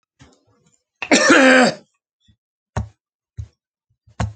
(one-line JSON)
{"cough_length": "4.4 s", "cough_amplitude": 29101, "cough_signal_mean_std_ratio": 0.35, "survey_phase": "alpha (2021-03-01 to 2021-08-12)", "age": "65+", "gender": "Male", "wearing_mask": "No", "symptom_none": true, "smoker_status": "Ex-smoker", "respiratory_condition_asthma": false, "respiratory_condition_other": false, "recruitment_source": "REACT", "submission_delay": "2 days", "covid_test_result": "Negative", "covid_test_method": "RT-qPCR"}